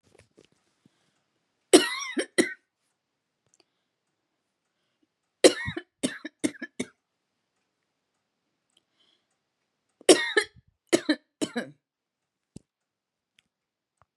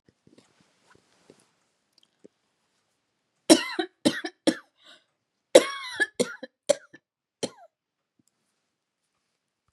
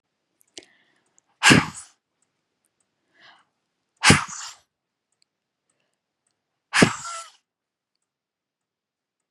{"three_cough_length": "14.2 s", "three_cough_amplitude": 28192, "three_cough_signal_mean_std_ratio": 0.2, "cough_length": "9.7 s", "cough_amplitude": 30876, "cough_signal_mean_std_ratio": 0.19, "exhalation_length": "9.3 s", "exhalation_amplitude": 31435, "exhalation_signal_mean_std_ratio": 0.2, "survey_phase": "beta (2021-08-13 to 2022-03-07)", "age": "45-64", "gender": "Female", "wearing_mask": "No", "symptom_none": true, "smoker_status": "Never smoked", "respiratory_condition_asthma": false, "respiratory_condition_other": false, "recruitment_source": "REACT", "submission_delay": "2 days", "covid_test_result": "Negative", "covid_test_method": "RT-qPCR", "influenza_a_test_result": "Negative", "influenza_b_test_result": "Negative"}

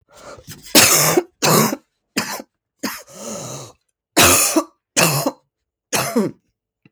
{"cough_length": "6.9 s", "cough_amplitude": 32768, "cough_signal_mean_std_ratio": 0.47, "survey_phase": "beta (2021-08-13 to 2022-03-07)", "age": "45-64", "gender": "Female", "wearing_mask": "No", "symptom_cough_any": true, "symptom_runny_or_blocked_nose": true, "symptom_shortness_of_breath": true, "symptom_sore_throat": true, "symptom_fatigue": true, "symptom_headache": true, "symptom_other": true, "symptom_onset": "3 days", "smoker_status": "Never smoked", "respiratory_condition_asthma": false, "respiratory_condition_other": false, "recruitment_source": "Test and Trace", "submission_delay": "2 days", "covid_test_result": "Positive", "covid_test_method": "ePCR"}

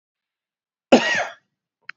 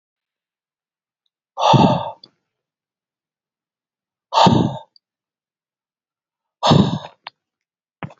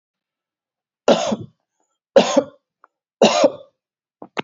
{"cough_length": "2.0 s", "cough_amplitude": 31437, "cough_signal_mean_std_ratio": 0.28, "exhalation_length": "8.2 s", "exhalation_amplitude": 32580, "exhalation_signal_mean_std_ratio": 0.3, "three_cough_length": "4.4 s", "three_cough_amplitude": 30560, "three_cough_signal_mean_std_ratio": 0.32, "survey_phase": "beta (2021-08-13 to 2022-03-07)", "age": "65+", "gender": "Male", "wearing_mask": "No", "symptom_none": true, "smoker_status": "Never smoked", "respiratory_condition_asthma": false, "respiratory_condition_other": false, "recruitment_source": "REACT", "submission_delay": "1 day", "covid_test_result": "Negative", "covid_test_method": "RT-qPCR", "influenza_a_test_result": "Unknown/Void", "influenza_b_test_result": "Unknown/Void"}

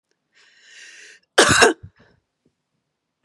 {"cough_length": "3.2 s", "cough_amplitude": 32768, "cough_signal_mean_std_ratio": 0.27, "survey_phase": "beta (2021-08-13 to 2022-03-07)", "age": "45-64", "gender": "Female", "wearing_mask": "No", "symptom_none": true, "smoker_status": "Never smoked", "respiratory_condition_asthma": false, "respiratory_condition_other": false, "recruitment_source": "REACT", "submission_delay": "1 day", "covid_test_result": "Negative", "covid_test_method": "RT-qPCR", "influenza_a_test_result": "Negative", "influenza_b_test_result": "Negative"}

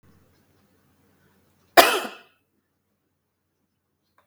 {"cough_length": "4.3 s", "cough_amplitude": 32768, "cough_signal_mean_std_ratio": 0.17, "survey_phase": "beta (2021-08-13 to 2022-03-07)", "age": "45-64", "gender": "Female", "wearing_mask": "No", "symptom_none": true, "smoker_status": "Never smoked", "respiratory_condition_asthma": false, "respiratory_condition_other": false, "recruitment_source": "REACT", "submission_delay": "2 days", "covid_test_result": "Negative", "covid_test_method": "RT-qPCR"}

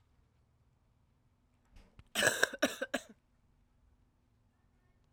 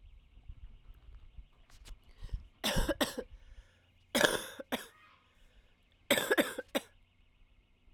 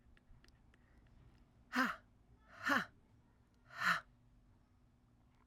{"cough_length": "5.1 s", "cough_amplitude": 10995, "cough_signal_mean_std_ratio": 0.24, "three_cough_length": "7.9 s", "three_cough_amplitude": 11552, "three_cough_signal_mean_std_ratio": 0.36, "exhalation_length": "5.5 s", "exhalation_amplitude": 3447, "exhalation_signal_mean_std_ratio": 0.32, "survey_phase": "alpha (2021-03-01 to 2021-08-12)", "age": "18-44", "gender": "Female", "wearing_mask": "No", "symptom_cough_any": true, "symptom_new_continuous_cough": true, "symptom_shortness_of_breath": true, "symptom_fatigue": true, "symptom_headache": true, "smoker_status": "Never smoked", "respiratory_condition_asthma": false, "respiratory_condition_other": false, "recruitment_source": "Test and Trace", "submission_delay": "1 day", "covid_test_result": "Positive", "covid_test_method": "RT-qPCR", "covid_ct_value": 17.2, "covid_ct_gene": "ORF1ab gene", "covid_ct_mean": 17.9, "covid_viral_load": "1400000 copies/ml", "covid_viral_load_category": "High viral load (>1M copies/ml)"}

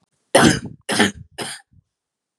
{"three_cough_length": "2.4 s", "three_cough_amplitude": 32042, "three_cough_signal_mean_std_ratio": 0.37, "survey_phase": "beta (2021-08-13 to 2022-03-07)", "age": "18-44", "gender": "Female", "wearing_mask": "No", "symptom_runny_or_blocked_nose": true, "smoker_status": "Never smoked", "respiratory_condition_asthma": false, "respiratory_condition_other": false, "recruitment_source": "Test and Trace", "submission_delay": "2 days", "covid_test_result": "Negative", "covid_test_method": "RT-qPCR"}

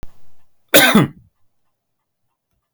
{"cough_length": "2.7 s", "cough_amplitude": 32768, "cough_signal_mean_std_ratio": 0.32, "survey_phase": "beta (2021-08-13 to 2022-03-07)", "age": "45-64", "gender": "Male", "wearing_mask": "No", "symptom_none": true, "smoker_status": "Never smoked", "respiratory_condition_asthma": false, "respiratory_condition_other": false, "recruitment_source": "REACT", "submission_delay": "3 days", "covid_test_result": "Negative", "covid_test_method": "RT-qPCR"}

